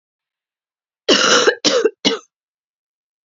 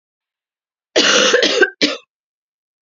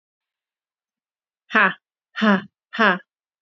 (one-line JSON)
{"three_cough_length": "3.2 s", "three_cough_amplitude": 32767, "three_cough_signal_mean_std_ratio": 0.41, "cough_length": "2.8 s", "cough_amplitude": 31115, "cough_signal_mean_std_ratio": 0.46, "exhalation_length": "3.4 s", "exhalation_amplitude": 29066, "exhalation_signal_mean_std_ratio": 0.32, "survey_phase": "beta (2021-08-13 to 2022-03-07)", "age": "18-44", "gender": "Female", "wearing_mask": "No", "symptom_cough_any": true, "symptom_runny_or_blocked_nose": true, "symptom_shortness_of_breath": true, "symptom_abdominal_pain": true, "symptom_fatigue": true, "symptom_headache": true, "symptom_other": true, "symptom_onset": "7 days", "smoker_status": "Never smoked", "respiratory_condition_asthma": true, "respiratory_condition_other": false, "recruitment_source": "REACT", "submission_delay": "1 day", "covid_test_result": "Positive", "covid_test_method": "RT-qPCR", "covid_ct_value": 22.5, "covid_ct_gene": "E gene", "influenza_a_test_result": "Negative", "influenza_b_test_result": "Negative"}